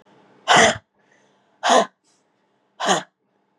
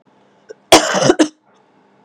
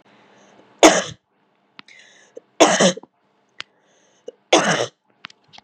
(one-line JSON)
{"exhalation_length": "3.6 s", "exhalation_amplitude": 29036, "exhalation_signal_mean_std_ratio": 0.34, "cough_length": "2.0 s", "cough_amplitude": 32768, "cough_signal_mean_std_ratio": 0.36, "three_cough_length": "5.6 s", "three_cough_amplitude": 32768, "three_cough_signal_mean_std_ratio": 0.29, "survey_phase": "beta (2021-08-13 to 2022-03-07)", "age": "18-44", "gender": "Female", "wearing_mask": "No", "symptom_cough_any": true, "symptom_new_continuous_cough": true, "symptom_runny_or_blocked_nose": true, "symptom_shortness_of_breath": true, "symptom_sore_throat": true, "symptom_fatigue": true, "symptom_fever_high_temperature": true, "symptom_headache": true, "symptom_onset": "3 days", "smoker_status": "Never smoked", "respiratory_condition_asthma": false, "respiratory_condition_other": false, "recruitment_source": "Test and Trace", "submission_delay": "2 days", "covid_test_result": "Positive", "covid_test_method": "RT-qPCR", "covid_ct_value": 20.6, "covid_ct_gene": "N gene"}